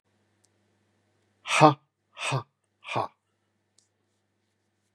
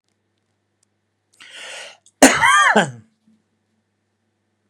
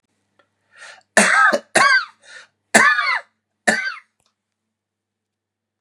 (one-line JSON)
{"exhalation_length": "4.9 s", "exhalation_amplitude": 27929, "exhalation_signal_mean_std_ratio": 0.22, "cough_length": "4.7 s", "cough_amplitude": 32768, "cough_signal_mean_std_ratio": 0.3, "three_cough_length": "5.8 s", "three_cough_amplitude": 32768, "three_cough_signal_mean_std_ratio": 0.39, "survey_phase": "beta (2021-08-13 to 2022-03-07)", "age": "45-64", "gender": "Male", "wearing_mask": "No", "symptom_none": true, "smoker_status": "Never smoked", "respiratory_condition_asthma": false, "respiratory_condition_other": false, "recruitment_source": "REACT", "submission_delay": "1 day", "covid_test_result": "Negative", "covid_test_method": "RT-qPCR", "influenza_a_test_result": "Negative", "influenza_b_test_result": "Negative"}